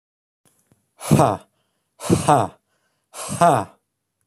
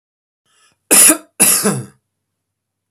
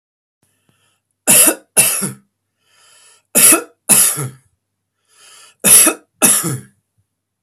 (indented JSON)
{
  "exhalation_length": "4.3 s",
  "exhalation_amplitude": 25492,
  "exhalation_signal_mean_std_ratio": 0.36,
  "cough_length": "2.9 s",
  "cough_amplitude": 32768,
  "cough_signal_mean_std_ratio": 0.37,
  "three_cough_length": "7.4 s",
  "three_cough_amplitude": 32768,
  "three_cough_signal_mean_std_ratio": 0.39,
  "survey_phase": "beta (2021-08-13 to 2022-03-07)",
  "age": "45-64",
  "gender": "Male",
  "wearing_mask": "No",
  "symptom_none": true,
  "smoker_status": "Never smoked",
  "respiratory_condition_asthma": false,
  "respiratory_condition_other": false,
  "recruitment_source": "REACT",
  "submission_delay": "3 days",
  "covid_test_result": "Negative",
  "covid_test_method": "RT-qPCR",
  "influenza_a_test_result": "Negative",
  "influenza_b_test_result": "Negative"
}